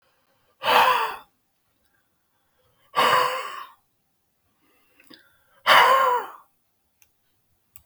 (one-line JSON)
{"exhalation_length": "7.9 s", "exhalation_amplitude": 28051, "exhalation_signal_mean_std_ratio": 0.36, "survey_phase": "beta (2021-08-13 to 2022-03-07)", "age": "65+", "gender": "Male", "wearing_mask": "No", "symptom_none": true, "smoker_status": "Never smoked", "respiratory_condition_asthma": false, "respiratory_condition_other": false, "recruitment_source": "REACT", "submission_delay": "5 days", "covid_test_result": "Negative", "covid_test_method": "RT-qPCR", "influenza_a_test_result": "Negative", "influenza_b_test_result": "Negative"}